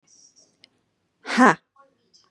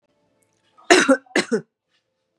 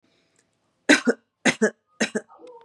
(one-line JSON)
{"exhalation_length": "2.3 s", "exhalation_amplitude": 30334, "exhalation_signal_mean_std_ratio": 0.24, "cough_length": "2.4 s", "cough_amplitude": 32767, "cough_signal_mean_std_ratio": 0.31, "three_cough_length": "2.6 s", "three_cough_amplitude": 27316, "three_cough_signal_mean_std_ratio": 0.31, "survey_phase": "beta (2021-08-13 to 2022-03-07)", "age": "18-44", "gender": "Female", "wearing_mask": "No", "symptom_none": true, "smoker_status": "Never smoked", "respiratory_condition_asthma": false, "respiratory_condition_other": false, "recruitment_source": "REACT", "submission_delay": "1 day", "covid_test_result": "Negative", "covid_test_method": "RT-qPCR", "influenza_a_test_result": "Negative", "influenza_b_test_result": "Negative"}